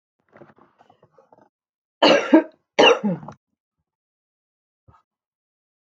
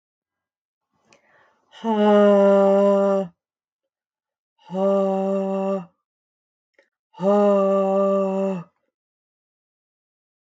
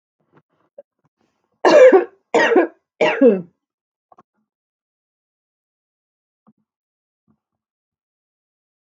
{"cough_length": "5.8 s", "cough_amplitude": 32242, "cough_signal_mean_std_ratio": 0.26, "exhalation_length": "10.4 s", "exhalation_amplitude": 15908, "exhalation_signal_mean_std_ratio": 0.53, "three_cough_length": "9.0 s", "three_cough_amplitude": 32342, "three_cough_signal_mean_std_ratio": 0.27, "survey_phase": "beta (2021-08-13 to 2022-03-07)", "age": "45-64", "gender": "Female", "wearing_mask": "No", "symptom_none": true, "smoker_status": "Ex-smoker", "respiratory_condition_asthma": false, "respiratory_condition_other": false, "recruitment_source": "REACT", "submission_delay": "8 days", "covid_test_result": "Negative", "covid_test_method": "RT-qPCR"}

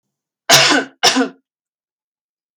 {"cough_length": "2.6 s", "cough_amplitude": 32768, "cough_signal_mean_std_ratio": 0.38, "survey_phase": "alpha (2021-03-01 to 2021-08-12)", "age": "18-44", "gender": "Female", "wearing_mask": "No", "symptom_abdominal_pain": true, "smoker_status": "Never smoked", "respiratory_condition_asthma": false, "respiratory_condition_other": false, "recruitment_source": "REACT", "submission_delay": "2 days", "covid_test_result": "Negative", "covid_test_method": "RT-qPCR"}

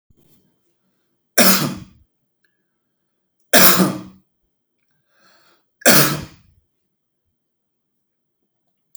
{"three_cough_length": "9.0 s", "three_cough_amplitude": 32768, "three_cough_signal_mean_std_ratio": 0.27, "survey_phase": "beta (2021-08-13 to 2022-03-07)", "age": "45-64", "gender": "Male", "wearing_mask": "No", "symptom_none": true, "smoker_status": "Ex-smoker", "respiratory_condition_asthma": false, "respiratory_condition_other": false, "recruitment_source": "Test and Trace", "submission_delay": "1 day", "covid_test_result": "Negative", "covid_test_method": "RT-qPCR"}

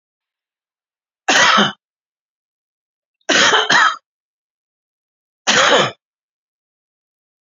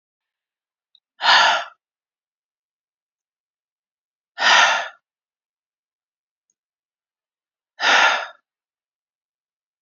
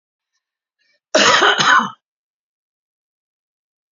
{"three_cough_length": "7.4 s", "three_cough_amplitude": 32265, "three_cough_signal_mean_std_ratio": 0.37, "exhalation_length": "9.8 s", "exhalation_amplitude": 27704, "exhalation_signal_mean_std_ratio": 0.28, "cough_length": "3.9 s", "cough_amplitude": 32767, "cough_signal_mean_std_ratio": 0.34, "survey_phase": "beta (2021-08-13 to 2022-03-07)", "age": "45-64", "gender": "Male", "wearing_mask": "No", "symptom_none": true, "smoker_status": "Never smoked", "respiratory_condition_asthma": false, "respiratory_condition_other": false, "recruitment_source": "REACT", "submission_delay": "3 days", "covid_test_result": "Negative", "covid_test_method": "RT-qPCR", "influenza_a_test_result": "Negative", "influenza_b_test_result": "Negative"}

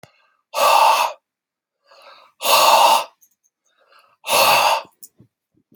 {"exhalation_length": "5.8 s", "exhalation_amplitude": 29903, "exhalation_signal_mean_std_ratio": 0.47, "survey_phase": "beta (2021-08-13 to 2022-03-07)", "age": "45-64", "gender": "Male", "wearing_mask": "No", "symptom_abdominal_pain": true, "symptom_diarrhoea": true, "smoker_status": "Never smoked", "respiratory_condition_asthma": false, "respiratory_condition_other": false, "recruitment_source": "REACT", "submission_delay": "3 days", "covid_test_result": "Negative", "covid_test_method": "RT-qPCR"}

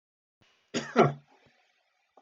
{"cough_length": "2.2 s", "cough_amplitude": 12933, "cough_signal_mean_std_ratio": 0.25, "survey_phase": "alpha (2021-03-01 to 2021-08-12)", "age": "45-64", "gender": "Male", "wearing_mask": "No", "symptom_none": true, "smoker_status": "Ex-smoker", "respiratory_condition_asthma": false, "respiratory_condition_other": false, "recruitment_source": "REACT", "submission_delay": "1 day", "covid_test_result": "Negative", "covid_test_method": "RT-qPCR"}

